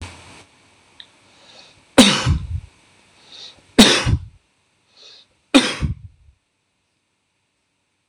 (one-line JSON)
{"three_cough_length": "8.1 s", "three_cough_amplitude": 26028, "three_cough_signal_mean_std_ratio": 0.29, "survey_phase": "beta (2021-08-13 to 2022-03-07)", "age": "45-64", "gender": "Male", "wearing_mask": "No", "symptom_none": true, "smoker_status": "Never smoked", "respiratory_condition_asthma": false, "respiratory_condition_other": false, "recruitment_source": "REACT", "submission_delay": "1 day", "covid_test_result": "Negative", "covid_test_method": "RT-qPCR", "influenza_a_test_result": "Negative", "influenza_b_test_result": "Negative"}